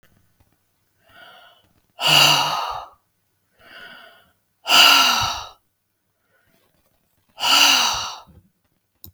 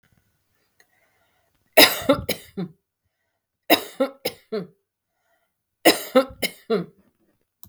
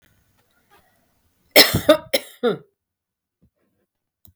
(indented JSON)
{
  "exhalation_length": "9.1 s",
  "exhalation_amplitude": 32613,
  "exhalation_signal_mean_std_ratio": 0.38,
  "three_cough_length": "7.7 s",
  "three_cough_amplitude": 32768,
  "three_cough_signal_mean_std_ratio": 0.27,
  "cough_length": "4.4 s",
  "cough_amplitude": 32768,
  "cough_signal_mean_std_ratio": 0.24,
  "survey_phase": "beta (2021-08-13 to 2022-03-07)",
  "age": "45-64",
  "gender": "Female",
  "wearing_mask": "No",
  "symptom_none": true,
  "smoker_status": "Never smoked",
  "respiratory_condition_asthma": false,
  "respiratory_condition_other": false,
  "recruitment_source": "REACT",
  "submission_delay": "2 days",
  "covid_test_result": "Negative",
  "covid_test_method": "RT-qPCR",
  "influenza_a_test_result": "Negative",
  "influenza_b_test_result": "Negative"
}